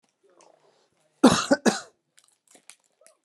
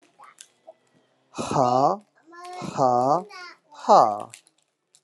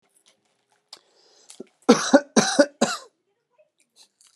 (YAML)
cough_length: 3.2 s
cough_amplitude: 24864
cough_signal_mean_std_ratio: 0.24
exhalation_length: 5.0 s
exhalation_amplitude: 23076
exhalation_signal_mean_std_ratio: 0.4
three_cough_length: 4.4 s
three_cough_amplitude: 31125
three_cough_signal_mean_std_ratio: 0.27
survey_phase: alpha (2021-03-01 to 2021-08-12)
age: 45-64
gender: Male
wearing_mask: 'No'
symptom_none: true
smoker_status: Never smoked
respiratory_condition_asthma: false
respiratory_condition_other: false
recruitment_source: REACT
submission_delay: 2 days
covid_test_result: Negative
covid_test_method: RT-qPCR